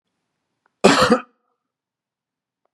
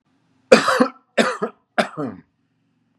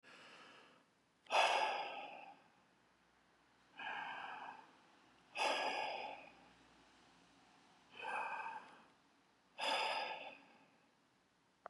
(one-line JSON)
{"cough_length": "2.7 s", "cough_amplitude": 32767, "cough_signal_mean_std_ratio": 0.27, "three_cough_length": "3.0 s", "three_cough_amplitude": 32768, "three_cough_signal_mean_std_ratio": 0.35, "exhalation_length": "11.7 s", "exhalation_amplitude": 2729, "exhalation_signal_mean_std_ratio": 0.46, "survey_phase": "beta (2021-08-13 to 2022-03-07)", "age": "45-64", "gender": "Male", "wearing_mask": "No", "symptom_none": true, "smoker_status": "Never smoked", "respiratory_condition_asthma": false, "respiratory_condition_other": false, "recruitment_source": "REACT", "submission_delay": "1 day", "covid_test_result": "Negative", "covid_test_method": "RT-qPCR", "influenza_a_test_result": "Negative", "influenza_b_test_result": "Negative"}